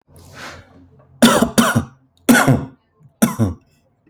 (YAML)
cough_length: 4.1 s
cough_amplitude: 32768
cough_signal_mean_std_ratio: 0.43
survey_phase: alpha (2021-03-01 to 2021-08-12)
age: 18-44
gender: Male
wearing_mask: 'No'
symptom_none: true
smoker_status: Ex-smoker
respiratory_condition_asthma: false
respiratory_condition_other: false
recruitment_source: REACT
submission_delay: 2 days
covid_test_result: Negative
covid_test_method: RT-qPCR